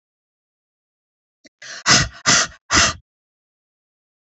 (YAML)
exhalation_length: 4.4 s
exhalation_amplitude: 32767
exhalation_signal_mean_std_ratio: 0.31
survey_phase: beta (2021-08-13 to 2022-03-07)
age: 65+
gender: Female
wearing_mask: 'No'
symptom_none: true
smoker_status: Never smoked
respiratory_condition_asthma: false
respiratory_condition_other: false
recruitment_source: REACT
submission_delay: 3 days
covid_test_result: Negative
covid_test_method: RT-qPCR
influenza_a_test_result: Negative
influenza_b_test_result: Negative